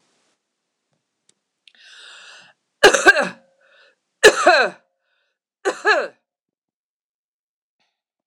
{"three_cough_length": "8.3 s", "three_cough_amplitude": 26028, "three_cough_signal_mean_std_ratio": 0.26, "survey_phase": "beta (2021-08-13 to 2022-03-07)", "age": "65+", "gender": "Female", "wearing_mask": "No", "symptom_cough_any": true, "symptom_runny_or_blocked_nose": true, "symptom_fatigue": true, "symptom_headache": true, "symptom_onset": "2 days", "smoker_status": "Never smoked", "respiratory_condition_asthma": false, "respiratory_condition_other": false, "recruitment_source": "Test and Trace", "submission_delay": "2 days", "covid_test_result": "Positive", "covid_test_method": "RT-qPCR", "covid_ct_value": 34.2, "covid_ct_gene": "ORF1ab gene", "covid_ct_mean": 35.7, "covid_viral_load": "2 copies/ml", "covid_viral_load_category": "Minimal viral load (< 10K copies/ml)"}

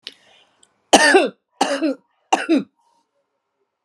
{"three_cough_length": "3.8 s", "three_cough_amplitude": 32768, "three_cough_signal_mean_std_ratio": 0.37, "survey_phase": "alpha (2021-03-01 to 2021-08-12)", "age": "45-64", "gender": "Female", "wearing_mask": "No", "symptom_none": true, "smoker_status": "Never smoked", "respiratory_condition_asthma": false, "respiratory_condition_other": false, "recruitment_source": "REACT", "submission_delay": "1 day", "covid_test_result": "Negative", "covid_test_method": "RT-qPCR"}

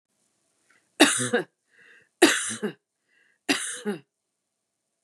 {"three_cough_length": "5.0 s", "three_cough_amplitude": 30074, "three_cough_signal_mean_std_ratio": 0.32, "survey_phase": "beta (2021-08-13 to 2022-03-07)", "age": "45-64", "gender": "Female", "wearing_mask": "No", "symptom_none": true, "smoker_status": "Never smoked", "respiratory_condition_asthma": false, "respiratory_condition_other": false, "recruitment_source": "REACT", "submission_delay": "2 days", "covid_test_result": "Negative", "covid_test_method": "RT-qPCR", "influenza_a_test_result": "Negative", "influenza_b_test_result": "Negative"}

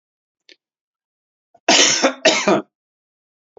{"cough_length": "3.6 s", "cough_amplitude": 31830, "cough_signal_mean_std_ratio": 0.36, "survey_phase": "beta (2021-08-13 to 2022-03-07)", "age": "45-64", "gender": "Male", "wearing_mask": "No", "symptom_runny_or_blocked_nose": true, "symptom_fatigue": true, "smoker_status": "Never smoked", "respiratory_condition_asthma": false, "respiratory_condition_other": false, "recruitment_source": "Test and Trace", "submission_delay": "2 days", "covid_test_result": "Positive", "covid_test_method": "RT-qPCR", "covid_ct_value": 18.8, "covid_ct_gene": "ORF1ab gene", "covid_ct_mean": 19.0, "covid_viral_load": "580000 copies/ml", "covid_viral_load_category": "Low viral load (10K-1M copies/ml)"}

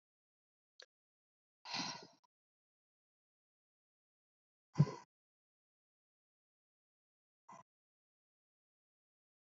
{"exhalation_length": "9.6 s", "exhalation_amplitude": 4114, "exhalation_signal_mean_std_ratio": 0.13, "survey_phase": "beta (2021-08-13 to 2022-03-07)", "age": "45-64", "gender": "Female", "wearing_mask": "No", "symptom_none": true, "smoker_status": "Ex-smoker", "respiratory_condition_asthma": false, "respiratory_condition_other": false, "recruitment_source": "REACT", "submission_delay": "4 days", "covid_test_result": "Negative", "covid_test_method": "RT-qPCR", "influenza_a_test_result": "Negative", "influenza_b_test_result": "Negative"}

